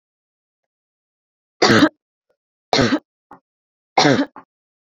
{"three_cough_length": "4.9 s", "three_cough_amplitude": 29046, "three_cough_signal_mean_std_ratio": 0.31, "survey_phase": "beta (2021-08-13 to 2022-03-07)", "age": "18-44", "gender": "Female", "wearing_mask": "No", "symptom_none": true, "smoker_status": "Never smoked", "respiratory_condition_asthma": false, "respiratory_condition_other": false, "recruitment_source": "REACT", "submission_delay": "2 days", "covid_test_result": "Negative", "covid_test_method": "RT-qPCR"}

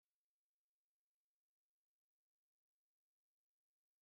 {"cough_length": "4.0 s", "cough_amplitude": 1, "cough_signal_mean_std_ratio": 0.1, "survey_phase": "beta (2021-08-13 to 2022-03-07)", "age": "45-64", "gender": "Male", "wearing_mask": "No", "symptom_runny_or_blocked_nose": true, "symptom_fatigue": true, "symptom_onset": "13 days", "smoker_status": "Never smoked", "respiratory_condition_asthma": false, "respiratory_condition_other": false, "recruitment_source": "REACT", "submission_delay": "1 day", "covid_test_result": "Negative", "covid_test_method": "RT-qPCR"}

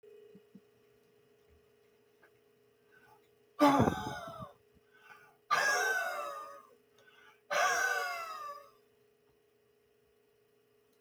{"exhalation_length": "11.0 s", "exhalation_amplitude": 9096, "exhalation_signal_mean_std_ratio": 0.37, "survey_phase": "beta (2021-08-13 to 2022-03-07)", "age": "65+", "gender": "Male", "wearing_mask": "No", "symptom_none": true, "smoker_status": "Ex-smoker", "respiratory_condition_asthma": false, "respiratory_condition_other": false, "recruitment_source": "REACT", "submission_delay": "9 days", "covid_test_result": "Negative", "covid_test_method": "RT-qPCR"}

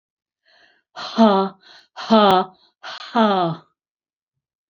{"exhalation_length": "4.7 s", "exhalation_amplitude": 28134, "exhalation_signal_mean_std_ratio": 0.39, "survey_phase": "beta (2021-08-13 to 2022-03-07)", "age": "65+", "gender": "Female", "wearing_mask": "No", "symptom_none": true, "smoker_status": "Never smoked", "respiratory_condition_asthma": true, "respiratory_condition_other": false, "recruitment_source": "REACT", "submission_delay": "2 days", "covid_test_result": "Negative", "covid_test_method": "RT-qPCR", "influenza_a_test_result": "Negative", "influenza_b_test_result": "Negative"}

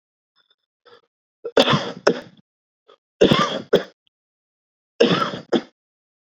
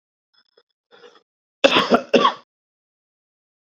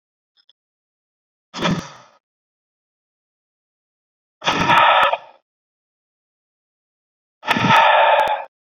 {"three_cough_length": "6.4 s", "three_cough_amplitude": 32768, "three_cough_signal_mean_std_ratio": 0.33, "cough_length": "3.8 s", "cough_amplitude": 28184, "cough_signal_mean_std_ratio": 0.27, "exhalation_length": "8.7 s", "exhalation_amplitude": 27786, "exhalation_signal_mean_std_ratio": 0.37, "survey_phase": "beta (2021-08-13 to 2022-03-07)", "age": "45-64", "gender": "Male", "wearing_mask": "No", "symptom_headache": true, "symptom_onset": "3 days", "smoker_status": "Current smoker (1 to 10 cigarettes per day)", "respiratory_condition_asthma": false, "respiratory_condition_other": false, "recruitment_source": "Test and Trace", "submission_delay": "2 days", "covid_test_result": "Positive", "covid_test_method": "RT-qPCR"}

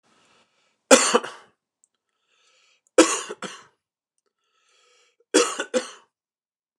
{"three_cough_length": "6.8 s", "three_cough_amplitude": 29204, "three_cough_signal_mean_std_ratio": 0.25, "survey_phase": "beta (2021-08-13 to 2022-03-07)", "age": "45-64", "gender": "Male", "wearing_mask": "No", "symptom_none": true, "smoker_status": "Never smoked", "respiratory_condition_asthma": false, "respiratory_condition_other": false, "recruitment_source": "REACT", "submission_delay": "7 days", "covid_test_result": "Negative", "covid_test_method": "RT-qPCR"}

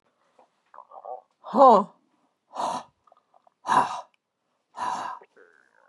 {"exhalation_length": "5.9 s", "exhalation_amplitude": 21649, "exhalation_signal_mean_std_ratio": 0.29, "survey_phase": "beta (2021-08-13 to 2022-03-07)", "age": "65+", "gender": "Female", "wearing_mask": "No", "symptom_runny_or_blocked_nose": true, "smoker_status": "Ex-smoker", "respiratory_condition_asthma": false, "respiratory_condition_other": false, "recruitment_source": "REACT", "submission_delay": "1 day", "covid_test_result": "Negative", "covid_test_method": "RT-qPCR", "influenza_a_test_result": "Negative", "influenza_b_test_result": "Negative"}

